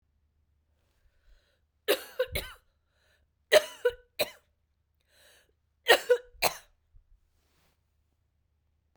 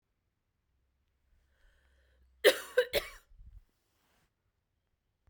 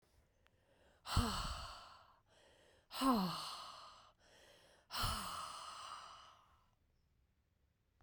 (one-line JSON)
{"three_cough_length": "9.0 s", "three_cough_amplitude": 16682, "three_cough_signal_mean_std_ratio": 0.22, "cough_length": "5.3 s", "cough_amplitude": 12846, "cough_signal_mean_std_ratio": 0.19, "exhalation_length": "8.0 s", "exhalation_amplitude": 2615, "exhalation_signal_mean_std_ratio": 0.43, "survey_phase": "beta (2021-08-13 to 2022-03-07)", "age": "45-64", "gender": "Female", "wearing_mask": "No", "symptom_cough_any": true, "symptom_new_continuous_cough": true, "symptom_runny_or_blocked_nose": true, "symptom_shortness_of_breath": true, "symptom_sore_throat": true, "symptom_fatigue": true, "symptom_headache": true, "symptom_other": true, "symptom_onset": "3 days", "smoker_status": "Never smoked", "respiratory_condition_asthma": false, "respiratory_condition_other": false, "recruitment_source": "Test and Trace", "submission_delay": "1 day", "covid_test_result": "Positive", "covid_test_method": "RT-qPCR", "covid_ct_value": 20.1, "covid_ct_gene": "ORF1ab gene"}